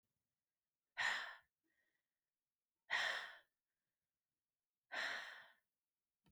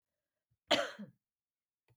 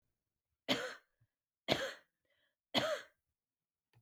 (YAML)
exhalation_length: 6.3 s
exhalation_amplitude: 1234
exhalation_signal_mean_std_ratio: 0.33
cough_length: 2.0 s
cough_amplitude: 5897
cough_signal_mean_std_ratio: 0.24
three_cough_length: 4.0 s
three_cough_amplitude: 6303
three_cough_signal_mean_std_ratio: 0.31
survey_phase: beta (2021-08-13 to 2022-03-07)
age: 45-64
gender: Female
wearing_mask: 'No'
symptom_change_to_sense_of_smell_or_taste: true
smoker_status: Ex-smoker
respiratory_condition_asthma: true
respiratory_condition_other: false
recruitment_source: REACT
submission_delay: 1 day
covid_test_result: Negative
covid_test_method: RT-qPCR